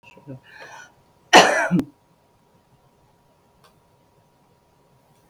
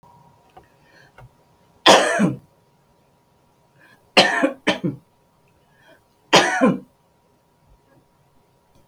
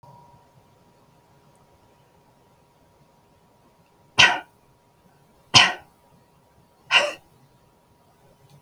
{"cough_length": "5.3 s", "cough_amplitude": 32768, "cough_signal_mean_std_ratio": 0.23, "three_cough_length": "8.9 s", "three_cough_amplitude": 32768, "three_cough_signal_mean_std_ratio": 0.3, "exhalation_length": "8.6 s", "exhalation_amplitude": 32768, "exhalation_signal_mean_std_ratio": 0.2, "survey_phase": "beta (2021-08-13 to 2022-03-07)", "age": "65+", "gender": "Female", "wearing_mask": "No", "symptom_none": true, "smoker_status": "Never smoked", "respiratory_condition_asthma": false, "respiratory_condition_other": false, "recruitment_source": "REACT", "submission_delay": "2 days", "covid_test_result": "Negative", "covid_test_method": "RT-qPCR", "influenza_a_test_result": "Negative", "influenza_b_test_result": "Negative"}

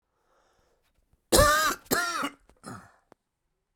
{"cough_length": "3.8 s", "cough_amplitude": 17725, "cough_signal_mean_std_ratio": 0.36, "survey_phase": "beta (2021-08-13 to 2022-03-07)", "age": "45-64", "gender": "Male", "wearing_mask": "No", "symptom_cough_any": true, "symptom_runny_or_blocked_nose": true, "symptom_abdominal_pain": true, "symptom_fatigue": true, "symptom_headache": true, "symptom_change_to_sense_of_smell_or_taste": true, "symptom_loss_of_taste": true, "symptom_onset": "4 days", "smoker_status": "Ex-smoker", "respiratory_condition_asthma": false, "respiratory_condition_other": true, "recruitment_source": "Test and Trace", "submission_delay": "1 day", "covid_test_result": "Positive", "covid_test_method": "RT-qPCR", "covid_ct_value": 14.8, "covid_ct_gene": "ORF1ab gene", "covid_ct_mean": 15.3, "covid_viral_load": "9700000 copies/ml", "covid_viral_load_category": "High viral load (>1M copies/ml)"}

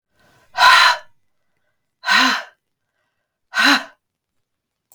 {"exhalation_length": "4.9 s", "exhalation_amplitude": 32768, "exhalation_signal_mean_std_ratio": 0.36, "survey_phase": "beta (2021-08-13 to 2022-03-07)", "age": "18-44", "gender": "Female", "wearing_mask": "No", "symptom_cough_any": true, "symptom_fatigue": true, "symptom_onset": "12 days", "smoker_status": "Never smoked", "respiratory_condition_asthma": false, "respiratory_condition_other": false, "recruitment_source": "REACT", "submission_delay": "3 days", "covid_test_result": "Negative", "covid_test_method": "RT-qPCR", "influenza_a_test_result": "Unknown/Void", "influenza_b_test_result": "Unknown/Void"}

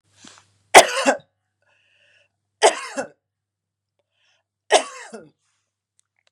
{"three_cough_length": "6.3 s", "three_cough_amplitude": 32768, "three_cough_signal_mean_std_ratio": 0.22, "survey_phase": "beta (2021-08-13 to 2022-03-07)", "age": "65+", "gender": "Female", "wearing_mask": "No", "symptom_none": true, "smoker_status": "Never smoked", "respiratory_condition_asthma": false, "respiratory_condition_other": false, "recruitment_source": "REACT", "submission_delay": "2 days", "covid_test_result": "Negative", "covid_test_method": "RT-qPCR", "influenza_a_test_result": "Negative", "influenza_b_test_result": "Negative"}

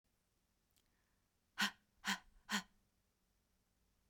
{"exhalation_length": "4.1 s", "exhalation_amplitude": 2285, "exhalation_signal_mean_std_ratio": 0.24, "survey_phase": "beta (2021-08-13 to 2022-03-07)", "age": "18-44", "gender": "Female", "wearing_mask": "No", "symptom_sore_throat": true, "symptom_onset": "2 days", "smoker_status": "Never smoked", "respiratory_condition_asthma": false, "respiratory_condition_other": false, "recruitment_source": "Test and Trace", "submission_delay": "1 day", "covid_test_result": "Positive", "covid_test_method": "RT-qPCR", "covid_ct_value": 25.5, "covid_ct_gene": "ORF1ab gene", "covid_ct_mean": 28.8, "covid_viral_load": "360 copies/ml", "covid_viral_load_category": "Minimal viral load (< 10K copies/ml)"}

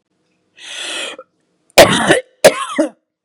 {"cough_length": "3.2 s", "cough_amplitude": 32768, "cough_signal_mean_std_ratio": 0.38, "survey_phase": "beta (2021-08-13 to 2022-03-07)", "age": "65+", "gender": "Female", "wearing_mask": "No", "symptom_none": true, "smoker_status": "Never smoked", "respiratory_condition_asthma": false, "respiratory_condition_other": false, "recruitment_source": "REACT", "submission_delay": "0 days", "covid_test_result": "Negative", "covid_test_method": "RT-qPCR"}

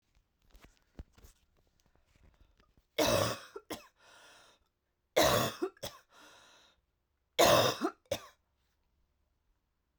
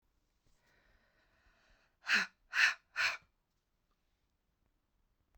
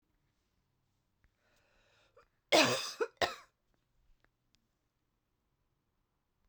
{"three_cough_length": "10.0 s", "three_cough_amplitude": 10348, "three_cough_signal_mean_std_ratio": 0.3, "exhalation_length": "5.4 s", "exhalation_amplitude": 5849, "exhalation_signal_mean_std_ratio": 0.26, "cough_length": "6.5 s", "cough_amplitude": 7667, "cough_signal_mean_std_ratio": 0.21, "survey_phase": "beta (2021-08-13 to 2022-03-07)", "age": "18-44", "gender": "Female", "wearing_mask": "No", "symptom_cough_any": true, "symptom_runny_or_blocked_nose": true, "symptom_abdominal_pain": true, "symptom_diarrhoea": true, "symptom_fatigue": true, "symptom_headache": true, "symptom_change_to_sense_of_smell_or_taste": true, "symptom_other": true, "symptom_onset": "10 days", "smoker_status": "Ex-smoker", "respiratory_condition_asthma": true, "respiratory_condition_other": false, "recruitment_source": "Test and Trace", "submission_delay": "2 days", "covid_test_result": "Positive", "covid_test_method": "RT-qPCR", "covid_ct_value": 24.7, "covid_ct_gene": "ORF1ab gene", "covid_ct_mean": 25.2, "covid_viral_load": "5400 copies/ml", "covid_viral_load_category": "Minimal viral load (< 10K copies/ml)"}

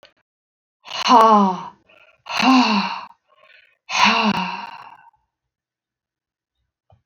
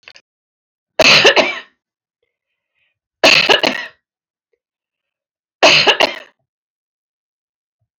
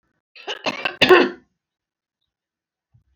{"exhalation_length": "7.1 s", "exhalation_amplitude": 28549, "exhalation_signal_mean_std_ratio": 0.41, "three_cough_length": "8.0 s", "three_cough_amplitude": 31589, "three_cough_signal_mean_std_ratio": 0.34, "cough_length": "3.2 s", "cough_amplitude": 28901, "cough_signal_mean_std_ratio": 0.28, "survey_phase": "alpha (2021-03-01 to 2021-08-12)", "age": "65+", "gender": "Female", "wearing_mask": "No", "symptom_none": true, "smoker_status": "Never smoked", "respiratory_condition_asthma": false, "respiratory_condition_other": false, "recruitment_source": "REACT", "submission_delay": "6 days", "covid_test_result": "Negative", "covid_test_method": "RT-qPCR"}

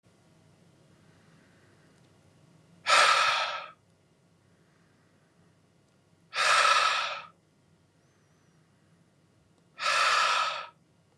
{"exhalation_length": "11.2 s", "exhalation_amplitude": 12100, "exhalation_signal_mean_std_ratio": 0.38, "survey_phase": "beta (2021-08-13 to 2022-03-07)", "age": "18-44", "gender": "Male", "wearing_mask": "No", "symptom_none": true, "symptom_onset": "11 days", "smoker_status": "Current smoker (1 to 10 cigarettes per day)", "respiratory_condition_asthma": false, "respiratory_condition_other": false, "recruitment_source": "REACT", "submission_delay": "8 days", "covid_test_result": "Negative", "covid_test_method": "RT-qPCR"}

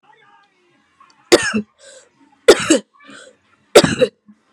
{"three_cough_length": "4.5 s", "three_cough_amplitude": 32768, "three_cough_signal_mean_std_ratio": 0.29, "survey_phase": "beta (2021-08-13 to 2022-03-07)", "age": "18-44", "gender": "Female", "wearing_mask": "No", "symptom_cough_any": true, "symptom_runny_or_blocked_nose": true, "symptom_diarrhoea": true, "symptom_fatigue": true, "symptom_change_to_sense_of_smell_or_taste": true, "symptom_onset": "4 days", "smoker_status": "Never smoked", "respiratory_condition_asthma": false, "respiratory_condition_other": false, "recruitment_source": "Test and Trace", "submission_delay": "2 days", "covid_test_result": "Positive", "covid_test_method": "RT-qPCR", "covid_ct_value": 17.3, "covid_ct_gene": "ORF1ab gene", "covid_ct_mean": 17.6, "covid_viral_load": "1600000 copies/ml", "covid_viral_load_category": "High viral load (>1M copies/ml)"}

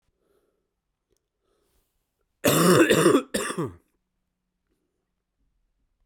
{"cough_length": "6.1 s", "cough_amplitude": 18952, "cough_signal_mean_std_ratio": 0.32, "survey_phase": "beta (2021-08-13 to 2022-03-07)", "age": "45-64", "gender": "Male", "wearing_mask": "No", "symptom_cough_any": true, "symptom_shortness_of_breath": true, "symptom_fatigue": true, "symptom_fever_high_temperature": true, "symptom_headache": true, "symptom_change_to_sense_of_smell_or_taste": true, "symptom_onset": "3 days", "smoker_status": "Never smoked", "respiratory_condition_asthma": true, "respiratory_condition_other": false, "recruitment_source": "Test and Trace", "submission_delay": "1 day", "covid_test_result": "Positive", "covid_test_method": "RT-qPCR", "covid_ct_value": 18.0, "covid_ct_gene": "ORF1ab gene"}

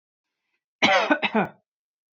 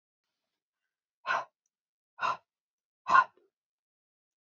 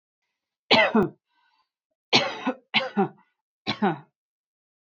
{"cough_length": "2.1 s", "cough_amplitude": 17508, "cough_signal_mean_std_ratio": 0.39, "exhalation_length": "4.4 s", "exhalation_amplitude": 12034, "exhalation_signal_mean_std_ratio": 0.22, "three_cough_length": "4.9 s", "three_cough_amplitude": 22765, "three_cough_signal_mean_std_ratio": 0.36, "survey_phase": "beta (2021-08-13 to 2022-03-07)", "age": "18-44", "gender": "Female", "wearing_mask": "No", "symptom_runny_or_blocked_nose": true, "smoker_status": "Ex-smoker", "respiratory_condition_asthma": false, "respiratory_condition_other": false, "recruitment_source": "REACT", "submission_delay": "2 days", "covid_test_result": "Negative", "covid_test_method": "RT-qPCR", "influenza_a_test_result": "Unknown/Void", "influenza_b_test_result": "Unknown/Void"}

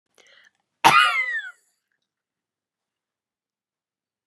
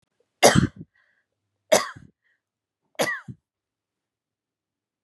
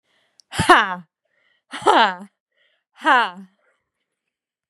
{"cough_length": "4.3 s", "cough_amplitude": 32767, "cough_signal_mean_std_ratio": 0.26, "three_cough_length": "5.0 s", "three_cough_amplitude": 29365, "three_cough_signal_mean_std_ratio": 0.23, "exhalation_length": "4.7 s", "exhalation_amplitude": 32767, "exhalation_signal_mean_std_ratio": 0.31, "survey_phase": "beta (2021-08-13 to 2022-03-07)", "age": "18-44", "gender": "Female", "wearing_mask": "No", "symptom_new_continuous_cough": true, "symptom_sore_throat": true, "smoker_status": "Never smoked", "respiratory_condition_asthma": false, "respiratory_condition_other": false, "recruitment_source": "Test and Trace", "submission_delay": "4 days", "covid_test_result": "Negative", "covid_test_method": "RT-qPCR"}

